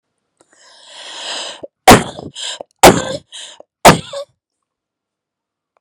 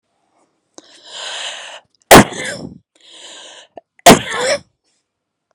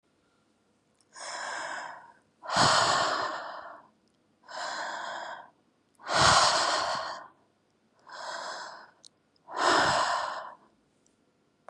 {"three_cough_length": "5.8 s", "three_cough_amplitude": 32768, "three_cough_signal_mean_std_ratio": 0.28, "cough_length": "5.5 s", "cough_amplitude": 32768, "cough_signal_mean_std_ratio": 0.28, "exhalation_length": "11.7 s", "exhalation_amplitude": 12579, "exhalation_signal_mean_std_ratio": 0.49, "survey_phase": "beta (2021-08-13 to 2022-03-07)", "age": "18-44", "gender": "Female", "wearing_mask": "No", "symptom_none": true, "smoker_status": "Never smoked", "respiratory_condition_asthma": false, "respiratory_condition_other": false, "recruitment_source": "REACT", "submission_delay": "1 day", "covid_test_result": "Negative", "covid_test_method": "RT-qPCR"}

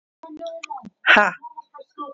{"exhalation_length": "2.1 s", "exhalation_amplitude": 27716, "exhalation_signal_mean_std_ratio": 0.35, "survey_phase": "alpha (2021-03-01 to 2021-08-12)", "age": "18-44", "gender": "Female", "wearing_mask": "No", "symptom_none": true, "symptom_cough_any": true, "smoker_status": "Current smoker (e-cigarettes or vapes only)", "respiratory_condition_asthma": false, "respiratory_condition_other": false, "recruitment_source": "REACT", "submission_delay": "2 days", "covid_test_result": "Negative", "covid_test_method": "RT-qPCR"}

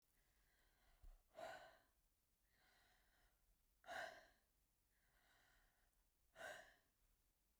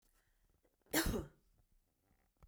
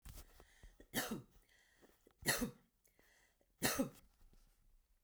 {"exhalation_length": "7.6 s", "exhalation_amplitude": 295, "exhalation_signal_mean_std_ratio": 0.4, "cough_length": "2.5 s", "cough_amplitude": 3411, "cough_signal_mean_std_ratio": 0.3, "three_cough_length": "5.0 s", "three_cough_amplitude": 2895, "three_cough_signal_mean_std_ratio": 0.35, "survey_phase": "beta (2021-08-13 to 2022-03-07)", "age": "45-64", "gender": "Female", "wearing_mask": "No", "symptom_none": true, "smoker_status": "Never smoked", "respiratory_condition_asthma": false, "respiratory_condition_other": false, "recruitment_source": "REACT", "submission_delay": "0 days", "covid_test_result": "Negative", "covid_test_method": "RT-qPCR"}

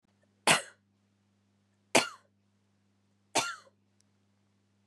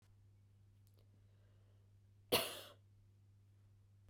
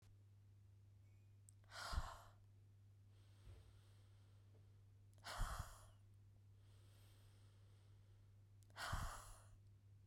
{"three_cough_length": "4.9 s", "three_cough_amplitude": 15295, "three_cough_signal_mean_std_ratio": 0.21, "cough_length": "4.1 s", "cough_amplitude": 3111, "cough_signal_mean_std_ratio": 0.27, "exhalation_length": "10.1 s", "exhalation_amplitude": 868, "exhalation_signal_mean_std_ratio": 0.53, "survey_phase": "beta (2021-08-13 to 2022-03-07)", "age": "18-44", "gender": "Female", "wearing_mask": "No", "symptom_cough_any": true, "symptom_runny_or_blocked_nose": true, "symptom_sore_throat": true, "symptom_fatigue": true, "symptom_headache": true, "symptom_other": true, "smoker_status": "Never smoked", "respiratory_condition_asthma": false, "respiratory_condition_other": false, "recruitment_source": "Test and Trace", "submission_delay": "2 days", "covid_test_result": "Positive", "covid_test_method": "RT-qPCR"}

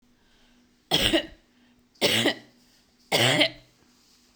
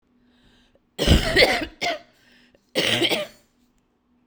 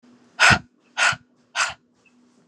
{"three_cough_length": "4.4 s", "three_cough_amplitude": 18663, "three_cough_signal_mean_std_ratio": 0.4, "cough_length": "4.3 s", "cough_amplitude": 29727, "cough_signal_mean_std_ratio": 0.42, "exhalation_length": "2.5 s", "exhalation_amplitude": 27748, "exhalation_signal_mean_std_ratio": 0.34, "survey_phase": "beta (2021-08-13 to 2022-03-07)", "age": "45-64", "gender": "Female", "wearing_mask": "No", "symptom_cough_any": true, "symptom_runny_or_blocked_nose": true, "symptom_sore_throat": true, "smoker_status": "Never smoked", "respiratory_condition_asthma": false, "respiratory_condition_other": false, "recruitment_source": "REACT", "submission_delay": "10 days", "covid_test_result": "Negative", "covid_test_method": "RT-qPCR"}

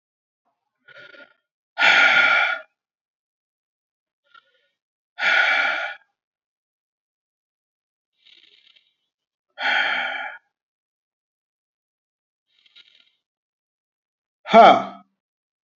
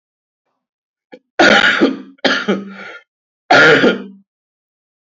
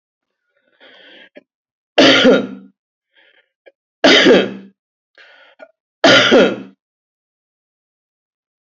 {"exhalation_length": "15.8 s", "exhalation_amplitude": 30560, "exhalation_signal_mean_std_ratio": 0.28, "cough_length": "5.0 s", "cough_amplitude": 29721, "cough_signal_mean_std_ratio": 0.44, "three_cough_length": "8.7 s", "three_cough_amplitude": 30207, "three_cough_signal_mean_std_ratio": 0.34, "survey_phase": "beta (2021-08-13 to 2022-03-07)", "age": "18-44", "gender": "Male", "wearing_mask": "No", "symptom_cough_any": true, "symptom_fever_high_temperature": true, "symptom_headache": true, "symptom_onset": "3 days", "smoker_status": "Never smoked", "respiratory_condition_asthma": false, "respiratory_condition_other": false, "recruitment_source": "Test and Trace", "submission_delay": "1 day", "covid_test_result": "Positive", "covid_test_method": "RT-qPCR", "covid_ct_value": 20.8, "covid_ct_gene": "N gene"}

